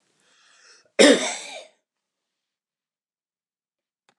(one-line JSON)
{"cough_length": "4.2 s", "cough_amplitude": 29203, "cough_signal_mean_std_ratio": 0.21, "survey_phase": "beta (2021-08-13 to 2022-03-07)", "age": "65+", "gender": "Male", "wearing_mask": "No", "symptom_fatigue": true, "smoker_status": "Never smoked", "respiratory_condition_asthma": false, "respiratory_condition_other": false, "recruitment_source": "REACT", "submission_delay": "3 days", "covid_test_result": "Negative", "covid_test_method": "RT-qPCR", "influenza_a_test_result": "Unknown/Void", "influenza_b_test_result": "Unknown/Void"}